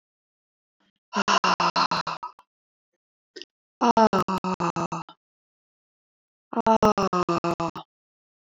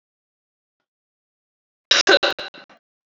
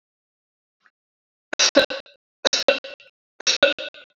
exhalation_length: 8.5 s
exhalation_amplitude: 18341
exhalation_signal_mean_std_ratio: 0.39
cough_length: 3.2 s
cough_amplitude: 27841
cough_signal_mean_std_ratio: 0.25
three_cough_length: 4.2 s
three_cough_amplitude: 27521
three_cough_signal_mean_std_ratio: 0.31
survey_phase: beta (2021-08-13 to 2022-03-07)
age: 45-64
gender: Female
wearing_mask: 'No'
symptom_none: true
smoker_status: Ex-smoker
respiratory_condition_asthma: false
respiratory_condition_other: false
recruitment_source: REACT
submission_delay: 1 day
covid_test_result: Negative
covid_test_method: RT-qPCR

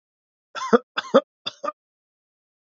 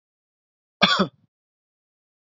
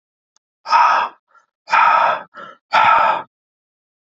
three_cough_length: 2.7 s
three_cough_amplitude: 24863
three_cough_signal_mean_std_ratio: 0.23
cough_length: 2.2 s
cough_amplitude: 27863
cough_signal_mean_std_ratio: 0.24
exhalation_length: 4.0 s
exhalation_amplitude: 27863
exhalation_signal_mean_std_ratio: 0.51
survey_phase: beta (2021-08-13 to 2022-03-07)
age: 18-44
gender: Male
wearing_mask: 'No'
symptom_none: true
smoker_status: Ex-smoker
respiratory_condition_asthma: false
respiratory_condition_other: false
recruitment_source: REACT
submission_delay: 1 day
covid_test_result: Negative
covid_test_method: RT-qPCR
influenza_a_test_result: Negative
influenza_b_test_result: Negative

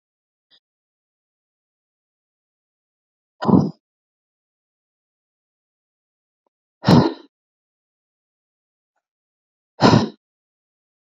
exhalation_length: 11.2 s
exhalation_amplitude: 32767
exhalation_signal_mean_std_ratio: 0.19
survey_phase: beta (2021-08-13 to 2022-03-07)
age: 18-44
gender: Female
wearing_mask: 'No'
symptom_none: true
smoker_status: Ex-smoker
respiratory_condition_asthma: false
respiratory_condition_other: false
recruitment_source: REACT
submission_delay: 1 day
covid_test_result: Negative
covid_test_method: RT-qPCR
influenza_a_test_result: Negative
influenza_b_test_result: Negative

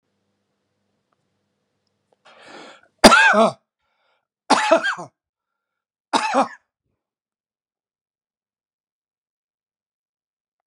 three_cough_length: 10.7 s
three_cough_amplitude: 32768
three_cough_signal_mean_std_ratio: 0.24
survey_phase: beta (2021-08-13 to 2022-03-07)
age: 45-64
gender: Male
wearing_mask: 'No'
symptom_none: true
symptom_onset: 12 days
smoker_status: Ex-smoker
respiratory_condition_asthma: true
respiratory_condition_other: false
recruitment_source: REACT
submission_delay: 4 days
covid_test_result: Negative
covid_test_method: RT-qPCR
influenza_a_test_result: Negative
influenza_b_test_result: Negative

